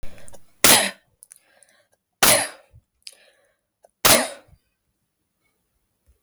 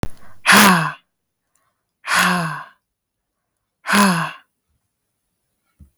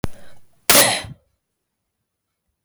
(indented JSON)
{
  "three_cough_length": "6.2 s",
  "three_cough_amplitude": 32768,
  "three_cough_signal_mean_std_ratio": 0.29,
  "exhalation_length": "6.0 s",
  "exhalation_amplitude": 32768,
  "exhalation_signal_mean_std_ratio": 0.39,
  "cough_length": "2.6 s",
  "cough_amplitude": 32768,
  "cough_signal_mean_std_ratio": 0.32,
  "survey_phase": "beta (2021-08-13 to 2022-03-07)",
  "age": "18-44",
  "gender": "Female",
  "wearing_mask": "No",
  "symptom_shortness_of_breath": true,
  "symptom_fatigue": true,
  "symptom_onset": "11 days",
  "smoker_status": "Never smoked",
  "respiratory_condition_asthma": false,
  "respiratory_condition_other": false,
  "recruitment_source": "REACT",
  "submission_delay": "3 days",
  "covid_test_result": "Negative",
  "covid_test_method": "RT-qPCR"
}